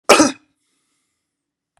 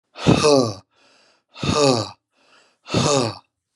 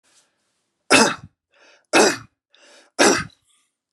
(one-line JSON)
{"cough_length": "1.8 s", "cough_amplitude": 32768, "cough_signal_mean_std_ratio": 0.26, "exhalation_length": "3.8 s", "exhalation_amplitude": 26596, "exhalation_signal_mean_std_ratio": 0.48, "three_cough_length": "3.9 s", "three_cough_amplitude": 32166, "three_cough_signal_mean_std_ratio": 0.33, "survey_phase": "beta (2021-08-13 to 2022-03-07)", "age": "65+", "gender": "Male", "wearing_mask": "No", "symptom_none": true, "smoker_status": "Never smoked", "respiratory_condition_asthma": false, "respiratory_condition_other": false, "recruitment_source": "REACT", "submission_delay": "1 day", "covid_test_result": "Negative", "covid_test_method": "RT-qPCR"}